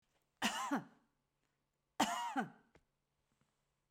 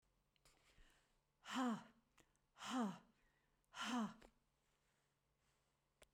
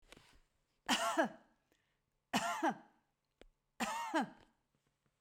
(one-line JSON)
{"cough_length": "3.9 s", "cough_amplitude": 3414, "cough_signal_mean_std_ratio": 0.36, "exhalation_length": "6.1 s", "exhalation_amplitude": 879, "exhalation_signal_mean_std_ratio": 0.35, "three_cough_length": "5.2 s", "three_cough_amplitude": 4177, "three_cough_signal_mean_std_ratio": 0.4, "survey_phase": "beta (2021-08-13 to 2022-03-07)", "age": "65+", "gender": "Female", "wearing_mask": "No", "symptom_none": true, "smoker_status": "Ex-smoker", "respiratory_condition_asthma": false, "respiratory_condition_other": false, "recruitment_source": "REACT", "submission_delay": "2 days", "covid_test_result": "Negative", "covid_test_method": "RT-qPCR"}